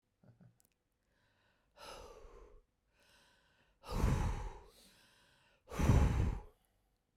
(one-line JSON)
{"exhalation_length": "7.2 s", "exhalation_amplitude": 3616, "exhalation_signal_mean_std_ratio": 0.35, "survey_phase": "beta (2021-08-13 to 2022-03-07)", "age": "45-64", "gender": "Female", "wearing_mask": "No", "symptom_none": true, "symptom_onset": "9 days", "smoker_status": "Never smoked", "respiratory_condition_asthma": false, "respiratory_condition_other": false, "recruitment_source": "REACT", "submission_delay": "6 days", "covid_test_result": "Negative", "covid_test_method": "RT-qPCR"}